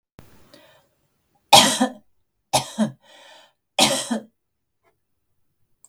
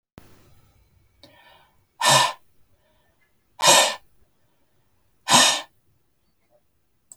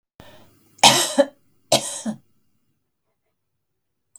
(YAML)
three_cough_length: 5.9 s
three_cough_amplitude: 32768
three_cough_signal_mean_std_ratio: 0.28
exhalation_length: 7.2 s
exhalation_amplitude: 32370
exhalation_signal_mean_std_ratio: 0.29
cough_length: 4.2 s
cough_amplitude: 32768
cough_signal_mean_std_ratio: 0.27
survey_phase: beta (2021-08-13 to 2022-03-07)
age: 65+
gender: Female
wearing_mask: 'No'
symptom_none: true
smoker_status: Never smoked
respiratory_condition_asthma: false
respiratory_condition_other: false
recruitment_source: REACT
submission_delay: 1 day
covid_test_result: Negative
covid_test_method: RT-qPCR